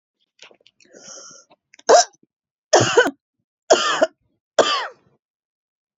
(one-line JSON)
{"three_cough_length": "6.0 s", "three_cough_amplitude": 28781, "three_cough_signal_mean_std_ratio": 0.32, "survey_phase": "beta (2021-08-13 to 2022-03-07)", "age": "18-44", "gender": "Female", "wearing_mask": "No", "symptom_cough_any": true, "symptom_runny_or_blocked_nose": true, "symptom_sore_throat": true, "symptom_abdominal_pain": true, "symptom_diarrhoea": true, "symptom_fatigue": true, "symptom_other": true, "smoker_status": "Never smoked", "respiratory_condition_asthma": false, "respiratory_condition_other": false, "recruitment_source": "REACT", "submission_delay": "4 days", "covid_test_result": "Negative", "covid_test_method": "RT-qPCR", "influenza_a_test_result": "Negative", "influenza_b_test_result": "Negative"}